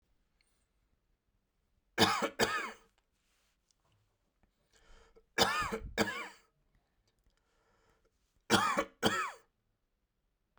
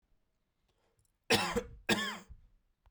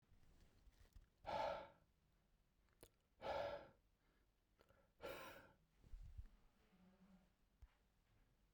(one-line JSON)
{"three_cough_length": "10.6 s", "three_cough_amplitude": 7906, "three_cough_signal_mean_std_ratio": 0.32, "cough_length": "2.9 s", "cough_amplitude": 6183, "cough_signal_mean_std_ratio": 0.35, "exhalation_length": "8.5 s", "exhalation_amplitude": 604, "exhalation_signal_mean_std_ratio": 0.4, "survey_phase": "beta (2021-08-13 to 2022-03-07)", "age": "45-64", "gender": "Male", "wearing_mask": "No", "symptom_cough_any": true, "symptom_runny_or_blocked_nose": true, "symptom_abdominal_pain": true, "symptom_fatigue": true, "symptom_fever_high_temperature": true, "symptom_headache": true, "smoker_status": "Never smoked", "respiratory_condition_asthma": false, "respiratory_condition_other": false, "recruitment_source": "Test and Trace", "submission_delay": "2 days", "covid_test_result": "Positive", "covid_test_method": "RT-qPCR", "covid_ct_value": 14.6, "covid_ct_gene": "ORF1ab gene", "covid_ct_mean": 15.3, "covid_viral_load": "9400000 copies/ml", "covid_viral_load_category": "High viral load (>1M copies/ml)"}